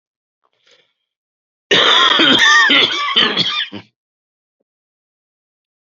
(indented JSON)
{
  "three_cough_length": "5.8 s",
  "three_cough_amplitude": 31059,
  "three_cough_signal_mean_std_ratio": 0.48,
  "survey_phase": "beta (2021-08-13 to 2022-03-07)",
  "age": "45-64",
  "gender": "Male",
  "wearing_mask": "No",
  "symptom_cough_any": true,
  "symptom_runny_or_blocked_nose": true,
  "symptom_fatigue": true,
  "symptom_fever_high_temperature": true,
  "symptom_onset": "4 days",
  "smoker_status": "Never smoked",
  "respiratory_condition_asthma": false,
  "respiratory_condition_other": false,
  "recruitment_source": "Test and Trace",
  "submission_delay": "2 days",
  "covid_test_result": "Positive",
  "covid_test_method": "RT-qPCR"
}